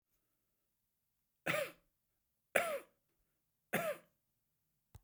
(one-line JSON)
{"three_cough_length": "5.0 s", "three_cough_amplitude": 5848, "three_cough_signal_mean_std_ratio": 0.29, "survey_phase": "beta (2021-08-13 to 2022-03-07)", "age": "65+", "gender": "Male", "wearing_mask": "No", "symptom_none": true, "smoker_status": "Ex-smoker", "respiratory_condition_asthma": false, "respiratory_condition_other": false, "recruitment_source": "REACT", "submission_delay": "5 days", "covid_test_result": "Negative", "covid_test_method": "RT-qPCR"}